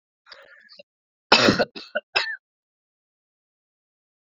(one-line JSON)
{"three_cough_length": "4.3 s", "three_cough_amplitude": 29620, "three_cough_signal_mean_std_ratio": 0.26, "survey_phase": "beta (2021-08-13 to 2022-03-07)", "age": "18-44", "gender": "Male", "wearing_mask": "No", "symptom_cough_any": true, "symptom_runny_or_blocked_nose": true, "symptom_headache": true, "symptom_change_to_sense_of_smell_or_taste": true, "symptom_loss_of_taste": true, "symptom_onset": "4 days", "smoker_status": "Current smoker (e-cigarettes or vapes only)", "respiratory_condition_asthma": false, "respiratory_condition_other": false, "recruitment_source": "Test and Trace", "submission_delay": "2 days", "covid_test_result": "Positive", "covid_test_method": "RT-qPCR", "covid_ct_value": 17.6, "covid_ct_gene": "ORF1ab gene", "covid_ct_mean": 18.4, "covid_viral_load": "920000 copies/ml", "covid_viral_load_category": "Low viral load (10K-1M copies/ml)"}